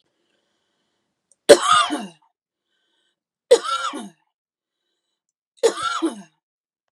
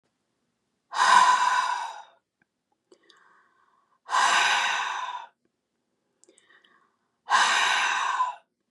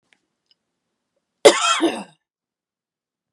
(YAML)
three_cough_length: 6.9 s
three_cough_amplitude: 32768
three_cough_signal_mean_std_ratio: 0.27
exhalation_length: 8.7 s
exhalation_amplitude: 18170
exhalation_signal_mean_std_ratio: 0.48
cough_length: 3.3 s
cough_amplitude: 32768
cough_signal_mean_std_ratio: 0.25
survey_phase: beta (2021-08-13 to 2022-03-07)
age: 45-64
gender: Female
wearing_mask: 'No'
symptom_none: true
smoker_status: Ex-smoker
respiratory_condition_asthma: false
respiratory_condition_other: false
recruitment_source: REACT
submission_delay: 4 days
covid_test_result: Negative
covid_test_method: RT-qPCR
influenza_a_test_result: Negative
influenza_b_test_result: Negative